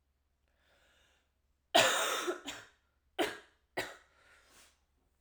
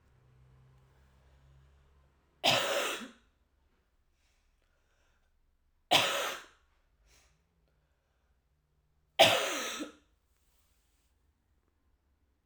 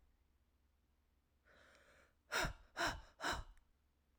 cough_length: 5.2 s
cough_amplitude: 7616
cough_signal_mean_std_ratio: 0.31
three_cough_length: 12.5 s
three_cough_amplitude: 14710
three_cough_signal_mean_std_ratio: 0.26
exhalation_length: 4.2 s
exhalation_amplitude: 1571
exhalation_signal_mean_std_ratio: 0.35
survey_phase: alpha (2021-03-01 to 2021-08-12)
age: 18-44
gender: Female
wearing_mask: 'No'
symptom_cough_any: true
symptom_fatigue: true
symptom_headache: true
symptom_change_to_sense_of_smell_or_taste: true
symptom_loss_of_taste: true
symptom_onset: 2 days
smoker_status: Never smoked
respiratory_condition_asthma: false
respiratory_condition_other: false
recruitment_source: Test and Trace
submission_delay: 1 day
covid_test_result: Positive
covid_test_method: RT-qPCR
covid_ct_value: 16.2
covid_ct_gene: ORF1ab gene
covid_ct_mean: 16.8
covid_viral_load: 3000000 copies/ml
covid_viral_load_category: High viral load (>1M copies/ml)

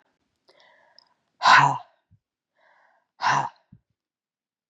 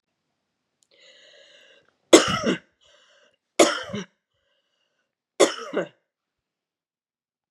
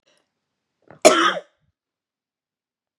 exhalation_length: 4.7 s
exhalation_amplitude: 25273
exhalation_signal_mean_std_ratio: 0.26
three_cough_length: 7.5 s
three_cough_amplitude: 32764
three_cough_signal_mean_std_ratio: 0.23
cough_length: 3.0 s
cough_amplitude: 32768
cough_signal_mean_std_ratio: 0.23
survey_phase: beta (2021-08-13 to 2022-03-07)
age: 45-64
gender: Female
wearing_mask: 'No'
symptom_cough_any: true
symptom_runny_or_blocked_nose: true
symptom_sore_throat: true
symptom_onset: 3 days
smoker_status: Never smoked
respiratory_condition_asthma: false
respiratory_condition_other: false
recruitment_source: Test and Trace
submission_delay: 2 days
covid_test_result: Positive
covid_test_method: RT-qPCR
covid_ct_value: 21.1
covid_ct_gene: ORF1ab gene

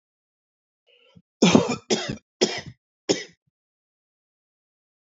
cough_length: 5.1 s
cough_amplitude: 26771
cough_signal_mean_std_ratio: 0.27
survey_phase: alpha (2021-03-01 to 2021-08-12)
age: 45-64
gender: Male
wearing_mask: 'No'
symptom_none: true
smoker_status: Ex-smoker
respiratory_condition_asthma: false
respiratory_condition_other: false
recruitment_source: REACT
submission_delay: 2 days
covid_test_result: Negative
covid_test_method: RT-qPCR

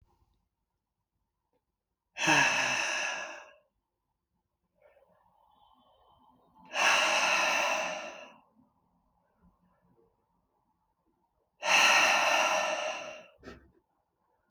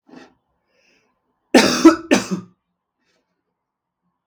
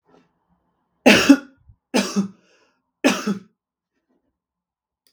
exhalation_length: 14.5 s
exhalation_amplitude: 9817
exhalation_signal_mean_std_ratio: 0.42
cough_length: 4.3 s
cough_amplitude: 32768
cough_signal_mean_std_ratio: 0.26
three_cough_length: 5.1 s
three_cough_amplitude: 32768
three_cough_signal_mean_std_ratio: 0.28
survey_phase: beta (2021-08-13 to 2022-03-07)
age: 18-44
gender: Male
wearing_mask: 'No'
symptom_none: true
smoker_status: Never smoked
respiratory_condition_asthma: false
respiratory_condition_other: false
recruitment_source: REACT
submission_delay: 3 days
covid_test_result: Negative
covid_test_method: RT-qPCR
influenza_a_test_result: Negative
influenza_b_test_result: Negative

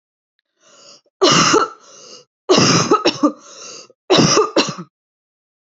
three_cough_length: 5.7 s
three_cough_amplitude: 31379
three_cough_signal_mean_std_ratio: 0.47
survey_phase: alpha (2021-03-01 to 2021-08-12)
age: 18-44
gender: Female
wearing_mask: 'No'
symptom_none: true
symptom_onset: 12 days
smoker_status: Never smoked
respiratory_condition_asthma: false
respiratory_condition_other: false
recruitment_source: REACT
submission_delay: 2 days
covid_test_result: Negative
covid_test_method: RT-qPCR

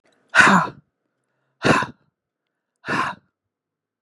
exhalation_length: 4.0 s
exhalation_amplitude: 32710
exhalation_signal_mean_std_ratio: 0.33
survey_phase: beta (2021-08-13 to 2022-03-07)
age: 65+
gender: Female
wearing_mask: 'No'
symptom_none: true
symptom_onset: 9 days
smoker_status: Ex-smoker
respiratory_condition_asthma: false
respiratory_condition_other: false
recruitment_source: REACT
submission_delay: 2 days
covid_test_result: Negative
covid_test_method: RT-qPCR
influenza_a_test_result: Unknown/Void
influenza_b_test_result: Unknown/Void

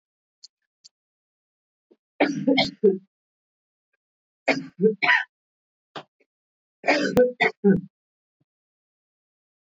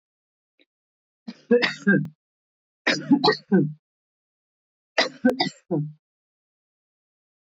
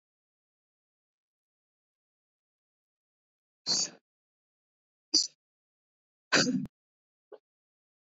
three_cough_length: 9.6 s
three_cough_amplitude: 15394
three_cough_signal_mean_std_ratio: 0.33
cough_length: 7.5 s
cough_amplitude: 15876
cough_signal_mean_std_ratio: 0.35
exhalation_length: 8.0 s
exhalation_amplitude: 10064
exhalation_signal_mean_std_ratio: 0.21
survey_phase: beta (2021-08-13 to 2022-03-07)
age: 45-64
gender: Female
wearing_mask: 'No'
symptom_cough_any: true
symptom_shortness_of_breath: true
symptom_onset: 11 days
smoker_status: Never smoked
respiratory_condition_asthma: true
respiratory_condition_other: false
recruitment_source: REACT
submission_delay: 4 days
covid_test_result: Negative
covid_test_method: RT-qPCR
influenza_a_test_result: Negative
influenza_b_test_result: Negative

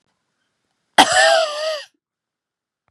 cough_length: 2.9 s
cough_amplitude: 32768
cough_signal_mean_std_ratio: 0.38
survey_phase: beta (2021-08-13 to 2022-03-07)
age: 45-64
gender: Female
wearing_mask: 'No'
symptom_none: true
smoker_status: Never smoked
respiratory_condition_asthma: false
respiratory_condition_other: false
recruitment_source: REACT
submission_delay: 1 day
covid_test_result: Negative
covid_test_method: RT-qPCR
influenza_a_test_result: Negative
influenza_b_test_result: Negative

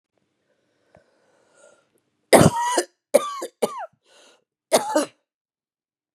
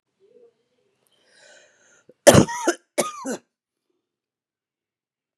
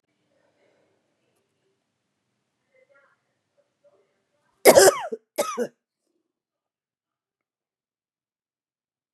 three_cough_length: 6.1 s
three_cough_amplitude: 32303
three_cough_signal_mean_std_ratio: 0.29
cough_length: 5.4 s
cough_amplitude: 32768
cough_signal_mean_std_ratio: 0.21
exhalation_length: 9.1 s
exhalation_amplitude: 31757
exhalation_signal_mean_std_ratio: 0.17
survey_phase: beta (2021-08-13 to 2022-03-07)
age: 45-64
gender: Female
wearing_mask: 'No'
symptom_cough_any: true
symptom_runny_or_blocked_nose: true
symptom_fatigue: true
smoker_status: Ex-smoker
respiratory_condition_asthma: false
respiratory_condition_other: false
recruitment_source: Test and Trace
submission_delay: 1 day
covid_test_result: Positive
covid_test_method: RT-qPCR
covid_ct_value: 20.2
covid_ct_gene: ORF1ab gene
covid_ct_mean: 20.5
covid_viral_load: 180000 copies/ml
covid_viral_load_category: Low viral load (10K-1M copies/ml)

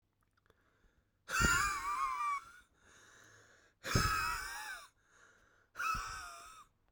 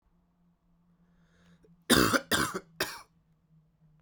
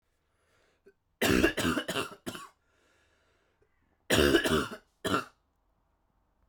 exhalation_length: 6.9 s
exhalation_amplitude: 4746
exhalation_signal_mean_std_ratio: 0.51
cough_length: 4.0 s
cough_amplitude: 14438
cough_signal_mean_std_ratio: 0.3
three_cough_length: 6.5 s
three_cough_amplitude: 11593
three_cough_signal_mean_std_ratio: 0.38
survey_phase: beta (2021-08-13 to 2022-03-07)
age: 18-44
gender: Male
wearing_mask: 'No'
symptom_cough_any: true
symptom_new_continuous_cough: true
symptom_runny_or_blocked_nose: true
symptom_shortness_of_breath: true
symptom_sore_throat: true
symptom_fatigue: true
symptom_fever_high_temperature: true
symptom_headache: true
symptom_change_to_sense_of_smell_or_taste: true
symptom_loss_of_taste: true
symptom_onset: 2 days
smoker_status: Ex-smoker
respiratory_condition_asthma: false
respiratory_condition_other: false
recruitment_source: Test and Trace
submission_delay: 2 days
covid_test_result: Positive
covid_test_method: RT-qPCR
covid_ct_value: 21.9
covid_ct_gene: ORF1ab gene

